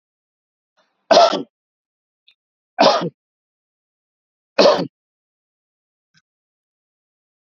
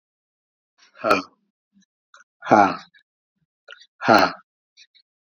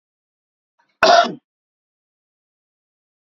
{"three_cough_length": "7.6 s", "three_cough_amplitude": 32767, "three_cough_signal_mean_std_ratio": 0.25, "exhalation_length": "5.3 s", "exhalation_amplitude": 28507, "exhalation_signal_mean_std_ratio": 0.27, "cough_length": "3.2 s", "cough_amplitude": 28893, "cough_signal_mean_std_ratio": 0.23, "survey_phase": "beta (2021-08-13 to 2022-03-07)", "age": "45-64", "gender": "Male", "wearing_mask": "Yes", "symptom_none": true, "smoker_status": "Never smoked", "respiratory_condition_asthma": false, "respiratory_condition_other": false, "recruitment_source": "REACT", "submission_delay": "5 days", "covid_test_result": "Negative", "covid_test_method": "RT-qPCR", "influenza_a_test_result": "Negative", "influenza_b_test_result": "Negative"}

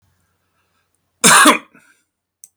{"cough_length": "2.6 s", "cough_amplitude": 32768, "cough_signal_mean_std_ratio": 0.3, "survey_phase": "beta (2021-08-13 to 2022-03-07)", "age": "45-64", "gender": "Male", "wearing_mask": "No", "symptom_none": true, "smoker_status": "Ex-smoker", "respiratory_condition_asthma": false, "respiratory_condition_other": false, "recruitment_source": "REACT", "submission_delay": "2 days", "covid_test_result": "Negative", "covid_test_method": "RT-qPCR", "influenza_a_test_result": "Unknown/Void", "influenza_b_test_result": "Unknown/Void"}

